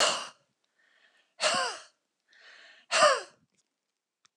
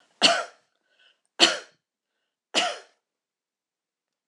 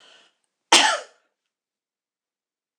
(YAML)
exhalation_length: 4.4 s
exhalation_amplitude: 11460
exhalation_signal_mean_std_ratio: 0.34
three_cough_length: 4.3 s
three_cough_amplitude: 25615
three_cough_signal_mean_std_ratio: 0.26
cough_length: 2.8 s
cough_amplitude: 26028
cough_signal_mean_std_ratio: 0.23
survey_phase: beta (2021-08-13 to 2022-03-07)
age: 65+
gender: Female
wearing_mask: 'No'
symptom_none: true
smoker_status: Never smoked
respiratory_condition_asthma: false
respiratory_condition_other: false
recruitment_source: REACT
submission_delay: 1 day
covid_test_result: Negative
covid_test_method: RT-qPCR
influenza_a_test_result: Negative
influenza_b_test_result: Negative